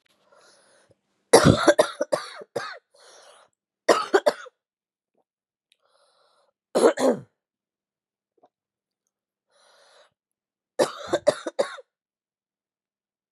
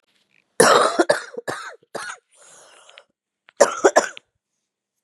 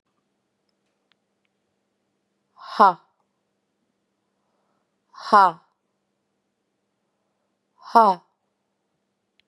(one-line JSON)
{"three_cough_length": "13.3 s", "three_cough_amplitude": 31714, "three_cough_signal_mean_std_ratio": 0.26, "cough_length": "5.0 s", "cough_amplitude": 32767, "cough_signal_mean_std_ratio": 0.33, "exhalation_length": "9.5 s", "exhalation_amplitude": 28613, "exhalation_signal_mean_std_ratio": 0.18, "survey_phase": "beta (2021-08-13 to 2022-03-07)", "age": "45-64", "gender": "Female", "wearing_mask": "No", "symptom_cough_any": true, "symptom_runny_or_blocked_nose": true, "symptom_fatigue": true, "symptom_fever_high_temperature": true, "symptom_change_to_sense_of_smell_or_taste": true, "symptom_onset": "5 days", "smoker_status": "Current smoker (e-cigarettes or vapes only)", "respiratory_condition_asthma": false, "respiratory_condition_other": false, "recruitment_source": "Test and Trace", "submission_delay": "2 days", "covid_test_result": "Positive", "covid_test_method": "RT-qPCR", "covid_ct_value": 17.8, "covid_ct_gene": "ORF1ab gene", "covid_ct_mean": 18.0, "covid_viral_load": "1300000 copies/ml", "covid_viral_load_category": "High viral load (>1M copies/ml)"}